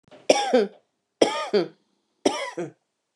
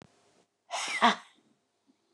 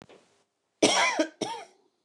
three_cough_length: 3.2 s
three_cough_amplitude: 26071
three_cough_signal_mean_std_ratio: 0.41
exhalation_length: 2.1 s
exhalation_amplitude: 12485
exhalation_signal_mean_std_ratio: 0.3
cough_length: 2.0 s
cough_amplitude: 17603
cough_signal_mean_std_ratio: 0.41
survey_phase: beta (2021-08-13 to 2022-03-07)
age: 45-64
gender: Female
wearing_mask: 'Yes'
symptom_runny_or_blocked_nose: true
symptom_sore_throat: true
symptom_diarrhoea: true
symptom_headache: true
symptom_other: true
symptom_onset: 3 days
smoker_status: Never smoked
respiratory_condition_asthma: false
respiratory_condition_other: false
recruitment_source: Test and Trace
submission_delay: 2 days
covid_test_result: Positive
covid_test_method: RT-qPCR
covid_ct_value: 20.2
covid_ct_gene: ORF1ab gene
covid_ct_mean: 20.5
covid_viral_load: 190000 copies/ml
covid_viral_load_category: Low viral load (10K-1M copies/ml)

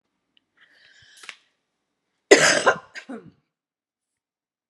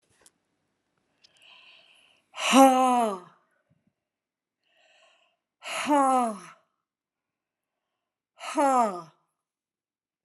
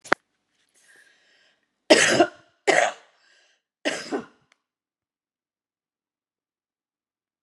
cough_length: 4.7 s
cough_amplitude: 32768
cough_signal_mean_std_ratio: 0.22
exhalation_length: 10.2 s
exhalation_amplitude: 19071
exhalation_signal_mean_std_ratio: 0.31
three_cough_length: 7.4 s
three_cough_amplitude: 32768
three_cough_signal_mean_std_ratio: 0.24
survey_phase: alpha (2021-03-01 to 2021-08-12)
age: 45-64
gender: Female
wearing_mask: 'No'
symptom_none: true
smoker_status: Never smoked
respiratory_condition_asthma: false
respiratory_condition_other: false
recruitment_source: REACT
submission_delay: 1 day
covid_test_result: Negative
covid_test_method: RT-qPCR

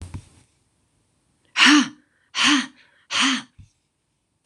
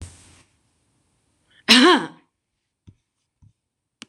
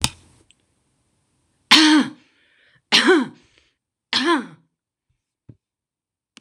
exhalation_length: 4.5 s
exhalation_amplitude: 26027
exhalation_signal_mean_std_ratio: 0.36
cough_length: 4.1 s
cough_amplitude: 26028
cough_signal_mean_std_ratio: 0.24
three_cough_length: 6.4 s
three_cough_amplitude: 26028
three_cough_signal_mean_std_ratio: 0.32
survey_phase: beta (2021-08-13 to 2022-03-07)
age: 65+
gender: Female
wearing_mask: 'No'
symptom_none: true
smoker_status: Ex-smoker
respiratory_condition_asthma: false
respiratory_condition_other: false
recruitment_source: REACT
submission_delay: 1 day
covid_test_result: Negative
covid_test_method: RT-qPCR
influenza_a_test_result: Negative
influenza_b_test_result: Negative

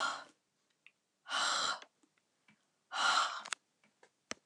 exhalation_length: 4.5 s
exhalation_amplitude: 5500
exhalation_signal_mean_std_ratio: 0.42
survey_phase: beta (2021-08-13 to 2022-03-07)
age: 65+
gender: Female
wearing_mask: 'No'
symptom_none: true
smoker_status: Never smoked
respiratory_condition_asthma: false
respiratory_condition_other: false
recruitment_source: REACT
submission_delay: 2 days
covid_test_result: Negative
covid_test_method: RT-qPCR
influenza_a_test_result: Negative
influenza_b_test_result: Negative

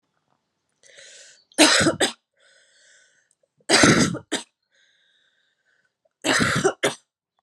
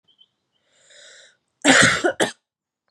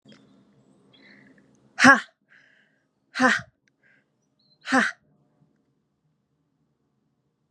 three_cough_length: 7.4 s
three_cough_amplitude: 31512
three_cough_signal_mean_std_ratio: 0.36
cough_length: 2.9 s
cough_amplitude: 31252
cough_signal_mean_std_ratio: 0.34
exhalation_length: 7.5 s
exhalation_amplitude: 30146
exhalation_signal_mean_std_ratio: 0.22
survey_phase: beta (2021-08-13 to 2022-03-07)
age: 18-44
gender: Female
wearing_mask: 'No'
symptom_cough_any: true
symptom_runny_or_blocked_nose: true
symptom_shortness_of_breath: true
symptom_sore_throat: true
symptom_abdominal_pain: true
symptom_fatigue: true
symptom_fever_high_temperature: true
symptom_headache: true
symptom_onset: 3 days
smoker_status: Never smoked
respiratory_condition_asthma: true
respiratory_condition_other: false
recruitment_source: Test and Trace
submission_delay: 2 days
covid_test_result: Positive
covid_test_method: RT-qPCR
covid_ct_value: 18.8
covid_ct_gene: ORF1ab gene
covid_ct_mean: 19.5
covid_viral_load: 410000 copies/ml
covid_viral_load_category: Low viral load (10K-1M copies/ml)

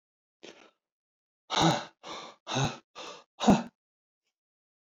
exhalation_length: 4.9 s
exhalation_amplitude: 13143
exhalation_signal_mean_std_ratio: 0.31
survey_phase: beta (2021-08-13 to 2022-03-07)
age: 45-64
gender: Male
wearing_mask: 'No'
symptom_none: true
smoker_status: Never smoked
respiratory_condition_asthma: false
respiratory_condition_other: false
recruitment_source: REACT
submission_delay: 2 days
covid_test_result: Negative
covid_test_method: RT-qPCR
influenza_a_test_result: Negative
influenza_b_test_result: Negative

